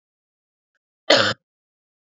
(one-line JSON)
{"cough_length": "2.1 s", "cough_amplitude": 32768, "cough_signal_mean_std_ratio": 0.24, "survey_phase": "beta (2021-08-13 to 2022-03-07)", "age": "18-44", "gender": "Female", "wearing_mask": "No", "symptom_cough_any": true, "symptom_runny_or_blocked_nose": true, "symptom_shortness_of_breath": true, "symptom_sore_throat": true, "symptom_fatigue": true, "symptom_other": true, "symptom_onset": "3 days", "smoker_status": "Never smoked", "respiratory_condition_asthma": false, "respiratory_condition_other": false, "recruitment_source": "Test and Trace", "submission_delay": "1 day", "covid_test_result": "Positive", "covid_test_method": "ePCR"}